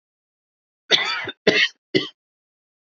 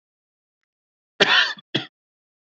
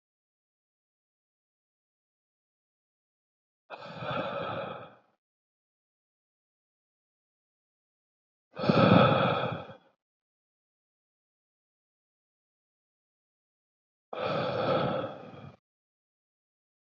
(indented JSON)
{
  "three_cough_length": "3.0 s",
  "three_cough_amplitude": 27288,
  "three_cough_signal_mean_std_ratio": 0.34,
  "cough_length": "2.5 s",
  "cough_amplitude": 29560,
  "cough_signal_mean_std_ratio": 0.29,
  "exhalation_length": "16.8 s",
  "exhalation_amplitude": 13601,
  "exhalation_signal_mean_std_ratio": 0.28,
  "survey_phase": "beta (2021-08-13 to 2022-03-07)",
  "age": "18-44",
  "gender": "Male",
  "wearing_mask": "No",
  "symptom_cough_any": true,
  "symptom_shortness_of_breath": true,
  "symptom_fatigue": true,
  "symptom_onset": "5 days",
  "smoker_status": "Never smoked",
  "respiratory_condition_asthma": false,
  "respiratory_condition_other": false,
  "recruitment_source": "Test and Trace",
  "submission_delay": "2 days",
  "covid_test_result": "Positive",
  "covid_test_method": "ePCR"
}